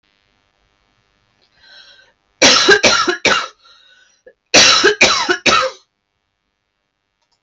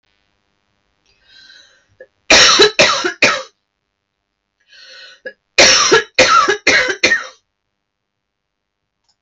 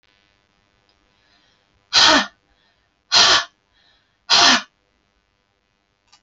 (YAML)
cough_length: 7.4 s
cough_amplitude: 32768
cough_signal_mean_std_ratio: 0.41
three_cough_length: 9.2 s
three_cough_amplitude: 32768
three_cough_signal_mean_std_ratio: 0.4
exhalation_length: 6.2 s
exhalation_amplitude: 32768
exhalation_signal_mean_std_ratio: 0.31
survey_phase: alpha (2021-03-01 to 2021-08-12)
age: 45-64
gender: Female
wearing_mask: 'No'
symptom_none: true
smoker_status: Never smoked
respiratory_condition_asthma: false
respiratory_condition_other: false
recruitment_source: REACT
submission_delay: 3 days
covid_test_result: Negative
covid_test_method: RT-qPCR